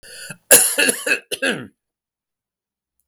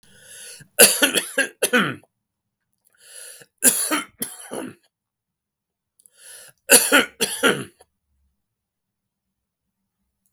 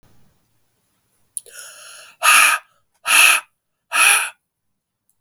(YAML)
cough_length: 3.1 s
cough_amplitude: 32768
cough_signal_mean_std_ratio: 0.37
three_cough_length: 10.3 s
three_cough_amplitude: 32768
three_cough_signal_mean_std_ratio: 0.31
exhalation_length: 5.2 s
exhalation_amplitude: 32768
exhalation_signal_mean_std_ratio: 0.37
survey_phase: beta (2021-08-13 to 2022-03-07)
age: 65+
gender: Male
wearing_mask: 'No'
symptom_cough_any: true
symptom_runny_or_blocked_nose: true
symptom_shortness_of_breath: true
symptom_fatigue: true
symptom_headache: true
symptom_onset: 3 days
smoker_status: Ex-smoker
respiratory_condition_asthma: false
respiratory_condition_other: false
recruitment_source: Test and Trace
submission_delay: 1 day
covid_test_result: Positive
covid_test_method: RT-qPCR